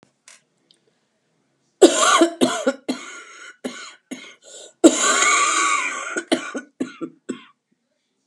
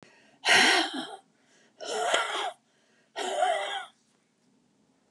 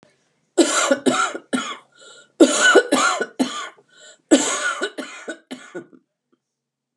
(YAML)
cough_length: 8.3 s
cough_amplitude: 32767
cough_signal_mean_std_ratio: 0.42
exhalation_length: 5.1 s
exhalation_amplitude: 12278
exhalation_signal_mean_std_ratio: 0.47
three_cough_length: 7.0 s
three_cough_amplitude: 31803
three_cough_signal_mean_std_ratio: 0.45
survey_phase: beta (2021-08-13 to 2022-03-07)
age: 65+
gender: Female
wearing_mask: 'No'
symptom_cough_any: true
symptom_fatigue: true
symptom_fever_high_temperature: true
symptom_change_to_sense_of_smell_or_taste: true
symptom_onset: 4 days
smoker_status: Ex-smoker
respiratory_condition_asthma: false
respiratory_condition_other: false
recruitment_source: Test and Trace
submission_delay: 2 days
covid_test_method: RT-qPCR
covid_ct_value: 27.7
covid_ct_gene: N gene